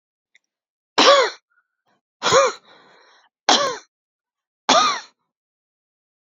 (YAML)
three_cough_length: 6.3 s
three_cough_amplitude: 29682
three_cough_signal_mean_std_ratio: 0.33
survey_phase: beta (2021-08-13 to 2022-03-07)
age: 45-64
gender: Female
wearing_mask: 'No'
symptom_none: true
smoker_status: Ex-smoker
respiratory_condition_asthma: false
respiratory_condition_other: false
recruitment_source: REACT
submission_delay: 2 days
covid_test_result: Negative
covid_test_method: RT-qPCR